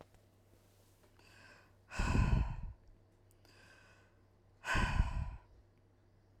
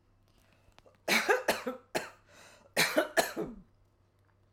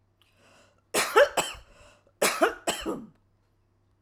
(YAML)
exhalation_length: 6.4 s
exhalation_amplitude: 3967
exhalation_signal_mean_std_ratio: 0.39
three_cough_length: 4.5 s
three_cough_amplitude: 9345
three_cough_signal_mean_std_ratio: 0.4
cough_length: 4.0 s
cough_amplitude: 16918
cough_signal_mean_std_ratio: 0.36
survey_phase: alpha (2021-03-01 to 2021-08-12)
age: 45-64
gender: Female
wearing_mask: 'No'
symptom_none: true
smoker_status: Ex-smoker
respiratory_condition_asthma: false
respiratory_condition_other: false
recruitment_source: REACT
submission_delay: 5 days
covid_test_result: Negative
covid_test_method: RT-qPCR